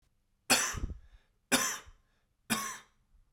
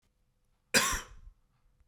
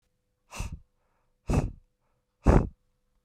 {"three_cough_length": "3.3 s", "three_cough_amplitude": 9608, "three_cough_signal_mean_std_ratio": 0.39, "cough_length": "1.9 s", "cough_amplitude": 10380, "cough_signal_mean_std_ratio": 0.31, "exhalation_length": "3.2 s", "exhalation_amplitude": 18009, "exhalation_signal_mean_std_ratio": 0.28, "survey_phase": "beta (2021-08-13 to 2022-03-07)", "age": "45-64", "gender": "Male", "wearing_mask": "No", "symptom_cough_any": true, "symptom_fatigue": true, "symptom_change_to_sense_of_smell_or_taste": true, "symptom_onset": "13 days", "smoker_status": "Never smoked", "respiratory_condition_asthma": false, "respiratory_condition_other": false, "recruitment_source": "REACT", "submission_delay": "3 days", "covid_test_result": "Negative", "covid_test_method": "RT-qPCR", "influenza_a_test_result": "Unknown/Void", "influenza_b_test_result": "Unknown/Void"}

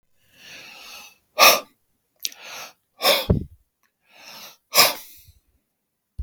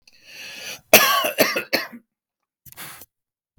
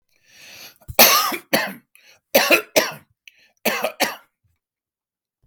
{"exhalation_length": "6.2 s", "exhalation_amplitude": 32767, "exhalation_signal_mean_std_ratio": 0.29, "cough_length": "3.6 s", "cough_amplitude": 32768, "cough_signal_mean_std_ratio": 0.35, "three_cough_length": "5.5 s", "three_cough_amplitude": 32768, "three_cough_signal_mean_std_ratio": 0.36, "survey_phase": "beta (2021-08-13 to 2022-03-07)", "age": "65+", "gender": "Male", "wearing_mask": "No", "symptom_none": true, "smoker_status": "Ex-smoker", "respiratory_condition_asthma": false, "respiratory_condition_other": false, "recruitment_source": "REACT", "submission_delay": "1 day", "covid_test_result": "Negative", "covid_test_method": "RT-qPCR", "influenza_a_test_result": "Negative", "influenza_b_test_result": "Negative"}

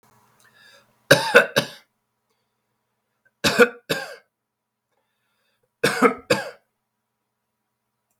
{"three_cough_length": "8.2 s", "three_cough_amplitude": 32768, "three_cough_signal_mean_std_ratio": 0.26, "survey_phase": "beta (2021-08-13 to 2022-03-07)", "age": "65+", "gender": "Male", "wearing_mask": "No", "symptom_cough_any": true, "symptom_runny_or_blocked_nose": true, "symptom_sore_throat": true, "symptom_fatigue": true, "symptom_loss_of_taste": true, "symptom_onset": "6 days", "smoker_status": "Ex-smoker", "respiratory_condition_asthma": false, "respiratory_condition_other": false, "recruitment_source": "Test and Trace", "submission_delay": "1 day", "covid_test_result": "Positive", "covid_test_method": "RT-qPCR", "covid_ct_value": 15.8, "covid_ct_gene": "N gene", "covid_ct_mean": 16.2, "covid_viral_load": "4900000 copies/ml", "covid_viral_load_category": "High viral load (>1M copies/ml)"}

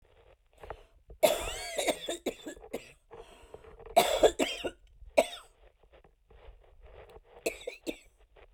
{"cough_length": "8.5 s", "cough_amplitude": 12633, "cough_signal_mean_std_ratio": 0.34, "survey_phase": "beta (2021-08-13 to 2022-03-07)", "age": "45-64", "gender": "Female", "wearing_mask": "No", "symptom_none": true, "smoker_status": "Ex-smoker", "respiratory_condition_asthma": false, "respiratory_condition_other": false, "recruitment_source": "REACT", "submission_delay": "3 days", "covid_test_result": "Negative", "covid_test_method": "RT-qPCR"}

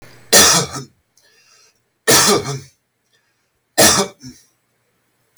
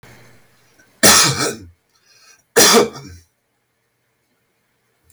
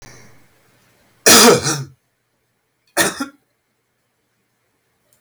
{"three_cough_length": "5.4 s", "three_cough_amplitude": 32768, "three_cough_signal_mean_std_ratio": 0.38, "exhalation_length": "5.1 s", "exhalation_amplitude": 32768, "exhalation_signal_mean_std_ratio": 0.33, "cough_length": "5.2 s", "cough_amplitude": 32768, "cough_signal_mean_std_ratio": 0.29, "survey_phase": "beta (2021-08-13 to 2022-03-07)", "age": "65+", "gender": "Male", "wearing_mask": "No", "symptom_none": true, "smoker_status": "Ex-smoker", "respiratory_condition_asthma": false, "respiratory_condition_other": false, "recruitment_source": "REACT", "submission_delay": "2 days", "covid_test_result": "Negative", "covid_test_method": "RT-qPCR"}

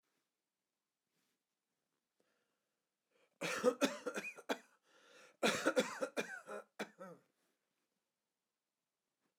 {"cough_length": "9.4 s", "cough_amplitude": 3736, "cough_signal_mean_std_ratio": 0.3, "survey_phase": "alpha (2021-03-01 to 2021-08-12)", "age": "65+", "gender": "Male", "wearing_mask": "No", "symptom_none": true, "smoker_status": "Never smoked", "respiratory_condition_asthma": false, "respiratory_condition_other": false, "recruitment_source": "REACT", "submission_delay": "3 days", "covid_test_result": "Negative", "covid_test_method": "RT-qPCR"}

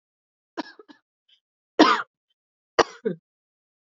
{"three_cough_length": "3.8 s", "three_cough_amplitude": 27089, "three_cough_signal_mean_std_ratio": 0.22, "survey_phase": "beta (2021-08-13 to 2022-03-07)", "age": "18-44", "gender": "Female", "wearing_mask": "No", "symptom_cough_any": true, "symptom_runny_or_blocked_nose": true, "symptom_shortness_of_breath": true, "symptom_sore_throat": true, "symptom_diarrhoea": true, "symptom_fatigue": true, "symptom_fever_high_temperature": true, "symptom_headache": true, "symptom_change_to_sense_of_smell_or_taste": true, "smoker_status": "Never smoked", "respiratory_condition_asthma": false, "respiratory_condition_other": false, "recruitment_source": "Test and Trace", "submission_delay": "1 day", "covid_test_result": "Positive", "covid_test_method": "RT-qPCR", "covid_ct_value": 15.8, "covid_ct_gene": "ORF1ab gene", "covid_ct_mean": 16.2, "covid_viral_load": "4800000 copies/ml", "covid_viral_load_category": "High viral load (>1M copies/ml)"}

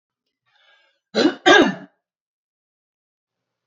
{"cough_length": "3.7 s", "cough_amplitude": 32746, "cough_signal_mean_std_ratio": 0.27, "survey_phase": "alpha (2021-03-01 to 2021-08-12)", "age": "45-64", "gender": "Female", "wearing_mask": "No", "symptom_fatigue": true, "symptom_onset": "13 days", "smoker_status": "Never smoked", "respiratory_condition_asthma": false, "respiratory_condition_other": false, "recruitment_source": "REACT", "submission_delay": "2 days", "covid_test_result": "Negative", "covid_test_method": "RT-qPCR"}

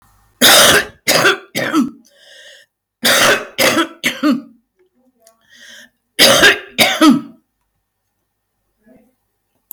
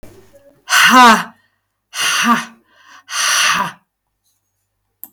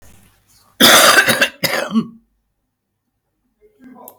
{"three_cough_length": "9.7 s", "three_cough_amplitude": 32768, "three_cough_signal_mean_std_ratio": 0.46, "exhalation_length": "5.1 s", "exhalation_amplitude": 32768, "exhalation_signal_mean_std_ratio": 0.45, "cough_length": "4.2 s", "cough_amplitude": 32768, "cough_signal_mean_std_ratio": 0.4, "survey_phase": "beta (2021-08-13 to 2022-03-07)", "age": "65+", "gender": "Female", "wearing_mask": "No", "symptom_cough_any": true, "smoker_status": "Current smoker (1 to 10 cigarettes per day)", "respiratory_condition_asthma": false, "respiratory_condition_other": false, "recruitment_source": "REACT", "submission_delay": "1 day", "covid_test_result": "Negative", "covid_test_method": "RT-qPCR"}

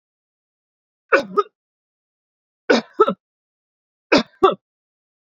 {"three_cough_length": "5.2 s", "three_cough_amplitude": 29722, "three_cough_signal_mean_std_ratio": 0.26, "survey_phase": "beta (2021-08-13 to 2022-03-07)", "age": "65+", "gender": "Male", "wearing_mask": "No", "symptom_none": true, "smoker_status": "Never smoked", "respiratory_condition_asthma": false, "respiratory_condition_other": false, "recruitment_source": "REACT", "submission_delay": "2 days", "covid_test_result": "Negative", "covid_test_method": "RT-qPCR"}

